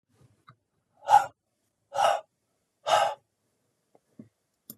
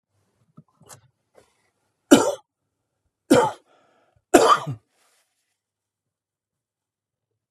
{"exhalation_length": "4.8 s", "exhalation_amplitude": 15926, "exhalation_signal_mean_std_ratio": 0.28, "three_cough_length": "7.5 s", "three_cough_amplitude": 32767, "three_cough_signal_mean_std_ratio": 0.23, "survey_phase": "beta (2021-08-13 to 2022-03-07)", "age": "65+", "gender": "Male", "wearing_mask": "No", "symptom_runny_or_blocked_nose": true, "smoker_status": "Never smoked", "respiratory_condition_asthma": false, "respiratory_condition_other": false, "recruitment_source": "Test and Trace", "submission_delay": "1 day", "covid_test_result": "Negative", "covid_test_method": "RT-qPCR"}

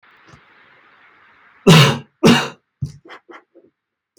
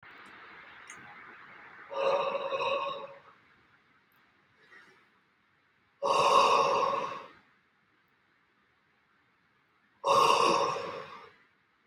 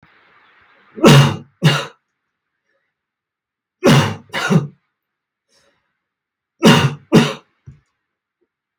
{"cough_length": "4.2 s", "cough_amplitude": 32768, "cough_signal_mean_std_ratio": 0.3, "exhalation_length": "11.9 s", "exhalation_amplitude": 9812, "exhalation_signal_mean_std_ratio": 0.43, "three_cough_length": "8.8 s", "three_cough_amplitude": 32768, "three_cough_signal_mean_std_ratio": 0.33, "survey_phase": "beta (2021-08-13 to 2022-03-07)", "age": "45-64", "gender": "Male", "wearing_mask": "No", "symptom_none": true, "smoker_status": "Never smoked", "respiratory_condition_asthma": false, "respiratory_condition_other": false, "recruitment_source": "REACT", "submission_delay": "5 days", "covid_test_result": "Negative", "covid_test_method": "RT-qPCR"}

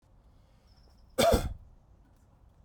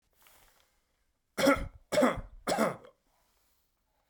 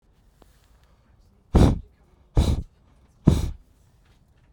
{"cough_length": "2.6 s", "cough_amplitude": 8735, "cough_signal_mean_std_ratio": 0.31, "three_cough_length": "4.1 s", "three_cough_amplitude": 7952, "three_cough_signal_mean_std_ratio": 0.36, "exhalation_length": "4.5 s", "exhalation_amplitude": 32767, "exhalation_signal_mean_std_ratio": 0.31, "survey_phase": "beta (2021-08-13 to 2022-03-07)", "age": "18-44", "gender": "Male", "wearing_mask": "No", "symptom_none": true, "smoker_status": "Never smoked", "respiratory_condition_asthma": false, "respiratory_condition_other": false, "recruitment_source": "REACT", "submission_delay": "1 day", "covid_test_result": "Negative", "covid_test_method": "RT-qPCR"}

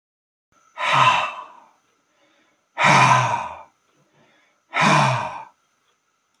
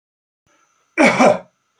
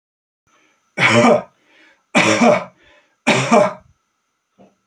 {"exhalation_length": "6.4 s", "exhalation_amplitude": 26245, "exhalation_signal_mean_std_ratio": 0.43, "cough_length": "1.8 s", "cough_amplitude": 30349, "cough_signal_mean_std_ratio": 0.38, "three_cough_length": "4.9 s", "three_cough_amplitude": 32767, "three_cough_signal_mean_std_ratio": 0.44, "survey_phase": "beta (2021-08-13 to 2022-03-07)", "age": "65+", "gender": "Male", "wearing_mask": "No", "symptom_runny_or_blocked_nose": true, "symptom_onset": "12 days", "smoker_status": "Never smoked", "respiratory_condition_asthma": false, "respiratory_condition_other": false, "recruitment_source": "REACT", "submission_delay": "1 day", "covid_test_result": "Negative", "covid_test_method": "RT-qPCR"}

